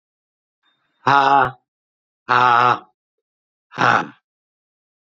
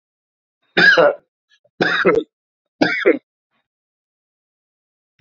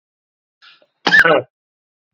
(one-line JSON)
{"exhalation_length": "5.0 s", "exhalation_amplitude": 31248, "exhalation_signal_mean_std_ratio": 0.36, "three_cough_length": "5.2 s", "three_cough_amplitude": 28750, "three_cough_signal_mean_std_ratio": 0.36, "cough_length": "2.1 s", "cough_amplitude": 29130, "cough_signal_mean_std_ratio": 0.32, "survey_phase": "beta (2021-08-13 to 2022-03-07)", "age": "65+", "gender": "Male", "wearing_mask": "No", "symptom_cough_any": true, "symptom_runny_or_blocked_nose": true, "symptom_diarrhoea": true, "symptom_fatigue": true, "symptom_fever_high_temperature": true, "symptom_headache": true, "smoker_status": "Never smoked", "respiratory_condition_asthma": false, "respiratory_condition_other": false, "recruitment_source": "Test and Trace", "submission_delay": "2 days", "covid_test_result": "Positive", "covid_test_method": "RT-qPCR", "covid_ct_value": 20.8, "covid_ct_gene": "ORF1ab gene", "covid_ct_mean": 21.6, "covid_viral_load": "83000 copies/ml", "covid_viral_load_category": "Low viral load (10K-1M copies/ml)"}